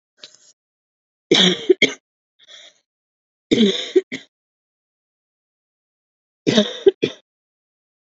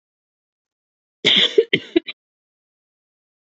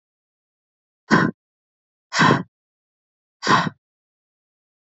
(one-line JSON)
{"three_cough_length": "8.1 s", "three_cough_amplitude": 30011, "three_cough_signal_mean_std_ratio": 0.28, "cough_length": "3.4 s", "cough_amplitude": 32331, "cough_signal_mean_std_ratio": 0.27, "exhalation_length": "4.9 s", "exhalation_amplitude": 26300, "exhalation_signal_mean_std_ratio": 0.29, "survey_phase": "beta (2021-08-13 to 2022-03-07)", "age": "18-44", "gender": "Female", "wearing_mask": "No", "symptom_cough_any": true, "symptom_runny_or_blocked_nose": true, "symptom_sore_throat": true, "symptom_headache": true, "smoker_status": "Never smoked", "respiratory_condition_asthma": false, "respiratory_condition_other": false, "recruitment_source": "Test and Trace", "submission_delay": "2 days", "covid_test_result": "Positive", "covid_test_method": "LFT"}